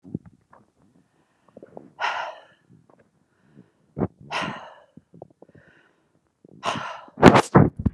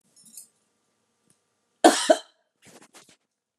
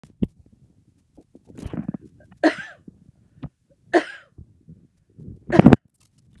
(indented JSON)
{
  "exhalation_length": "7.9 s",
  "exhalation_amplitude": 32768,
  "exhalation_signal_mean_std_ratio": 0.24,
  "cough_length": "3.6 s",
  "cough_amplitude": 26491,
  "cough_signal_mean_std_ratio": 0.2,
  "three_cough_length": "6.4 s",
  "three_cough_amplitude": 32768,
  "three_cough_signal_mean_std_ratio": 0.21,
  "survey_phase": "beta (2021-08-13 to 2022-03-07)",
  "age": "65+",
  "gender": "Female",
  "wearing_mask": "No",
  "symptom_none": true,
  "smoker_status": "Ex-smoker",
  "respiratory_condition_asthma": false,
  "respiratory_condition_other": false,
  "recruitment_source": "REACT",
  "submission_delay": "1 day",
  "covid_test_result": "Negative",
  "covid_test_method": "RT-qPCR",
  "influenza_a_test_result": "Negative",
  "influenza_b_test_result": "Negative"
}